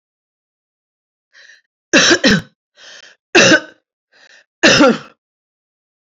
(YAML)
three_cough_length: 6.1 s
three_cough_amplitude: 32768
three_cough_signal_mean_std_ratio: 0.35
survey_phase: alpha (2021-03-01 to 2021-08-12)
age: 45-64
gender: Female
wearing_mask: 'No'
symptom_none: true
smoker_status: Never smoked
respiratory_condition_asthma: true
respiratory_condition_other: false
recruitment_source: REACT
submission_delay: 2 days
covid_test_result: Negative
covid_test_method: RT-qPCR